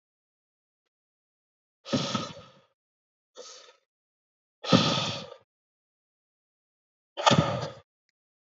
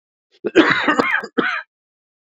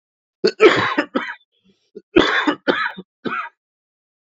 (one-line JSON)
{"exhalation_length": "8.4 s", "exhalation_amplitude": 18766, "exhalation_signal_mean_std_ratio": 0.28, "cough_length": "2.3 s", "cough_amplitude": 32689, "cough_signal_mean_std_ratio": 0.48, "three_cough_length": "4.3 s", "three_cough_amplitude": 32767, "three_cough_signal_mean_std_ratio": 0.41, "survey_phase": "beta (2021-08-13 to 2022-03-07)", "age": "18-44", "gender": "Male", "wearing_mask": "No", "symptom_cough_any": true, "symptom_runny_or_blocked_nose": true, "symptom_sore_throat": true, "symptom_fatigue": true, "symptom_headache": true, "symptom_change_to_sense_of_smell_or_taste": true, "symptom_onset": "2 days", "smoker_status": "Never smoked", "respiratory_condition_asthma": false, "respiratory_condition_other": false, "recruitment_source": "Test and Trace", "submission_delay": "2 days", "covid_test_result": "Positive", "covid_test_method": "RT-qPCR", "covid_ct_value": 17.6, "covid_ct_gene": "ORF1ab gene", "covid_ct_mean": 17.8, "covid_viral_load": "1400000 copies/ml", "covid_viral_load_category": "High viral load (>1M copies/ml)"}